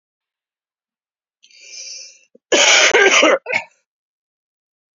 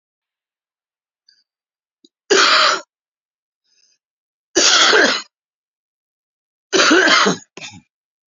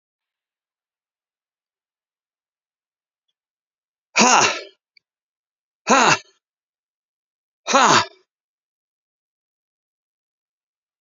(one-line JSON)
{"cough_length": "4.9 s", "cough_amplitude": 31265, "cough_signal_mean_std_ratio": 0.37, "three_cough_length": "8.3 s", "three_cough_amplitude": 32768, "three_cough_signal_mean_std_ratio": 0.39, "exhalation_length": "11.0 s", "exhalation_amplitude": 32767, "exhalation_signal_mean_std_ratio": 0.23, "survey_phase": "beta (2021-08-13 to 2022-03-07)", "age": "45-64", "gender": "Male", "wearing_mask": "No", "symptom_new_continuous_cough": true, "symptom_fatigue": true, "symptom_onset": "3 days", "smoker_status": "Never smoked", "respiratory_condition_asthma": false, "respiratory_condition_other": false, "recruitment_source": "Test and Trace", "submission_delay": "2 days", "covid_test_result": "Positive", "covid_test_method": "RT-qPCR", "covid_ct_value": 17.1, "covid_ct_gene": "ORF1ab gene", "covid_ct_mean": 17.6, "covid_viral_load": "1700000 copies/ml", "covid_viral_load_category": "High viral load (>1M copies/ml)"}